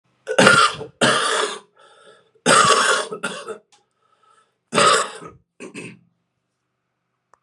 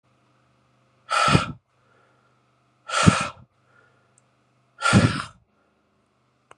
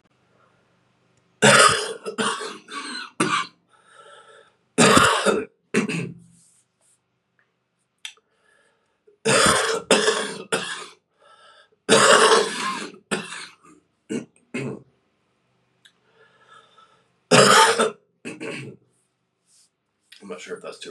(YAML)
cough_length: 7.4 s
cough_amplitude: 32768
cough_signal_mean_std_ratio: 0.43
exhalation_length: 6.6 s
exhalation_amplitude: 31836
exhalation_signal_mean_std_ratio: 0.31
three_cough_length: 20.9 s
three_cough_amplitude: 32607
three_cough_signal_mean_std_ratio: 0.39
survey_phase: alpha (2021-03-01 to 2021-08-12)
age: 45-64
gender: Male
wearing_mask: 'No'
symptom_cough_any: true
symptom_fatigue: true
symptom_fever_high_temperature: true
symptom_headache: true
smoker_status: Current smoker (1 to 10 cigarettes per day)
respiratory_condition_asthma: false
respiratory_condition_other: false
recruitment_source: Test and Trace
submission_delay: 0 days
covid_test_result: Positive
covid_test_method: LFT